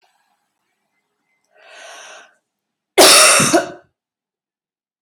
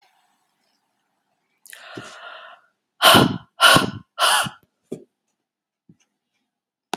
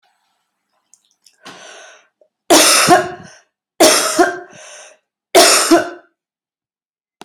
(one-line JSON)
{"cough_length": "5.0 s", "cough_amplitude": 32768, "cough_signal_mean_std_ratio": 0.31, "exhalation_length": "7.0 s", "exhalation_amplitude": 32767, "exhalation_signal_mean_std_ratio": 0.29, "three_cough_length": "7.2 s", "three_cough_amplitude": 32768, "three_cough_signal_mean_std_ratio": 0.4, "survey_phase": "beta (2021-08-13 to 2022-03-07)", "age": "18-44", "gender": "Female", "wearing_mask": "No", "symptom_headache": true, "smoker_status": "Never smoked", "respiratory_condition_asthma": false, "respiratory_condition_other": false, "recruitment_source": "REACT", "submission_delay": "6 days", "covid_test_result": "Negative", "covid_test_method": "RT-qPCR"}